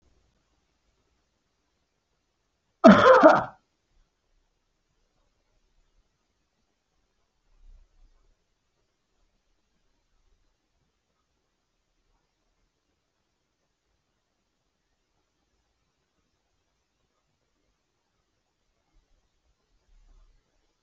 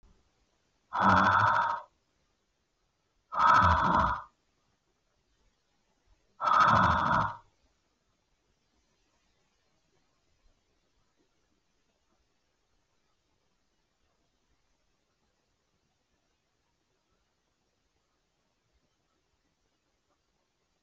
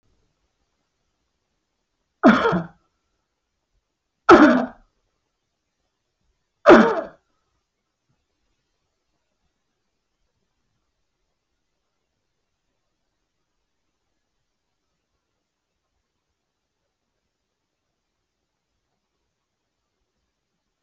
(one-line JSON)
{"cough_length": "20.8 s", "cough_amplitude": 27877, "cough_signal_mean_std_ratio": 0.13, "exhalation_length": "20.8 s", "exhalation_amplitude": 10156, "exhalation_signal_mean_std_ratio": 0.29, "three_cough_length": "20.8 s", "three_cough_amplitude": 28397, "three_cough_signal_mean_std_ratio": 0.16, "survey_phase": "alpha (2021-03-01 to 2021-08-12)", "age": "65+", "gender": "Male", "wearing_mask": "No", "symptom_none": true, "smoker_status": "Never smoked", "respiratory_condition_asthma": false, "respiratory_condition_other": false, "recruitment_source": "REACT", "submission_delay": "2 days", "covid_test_result": "Negative", "covid_test_method": "RT-qPCR"}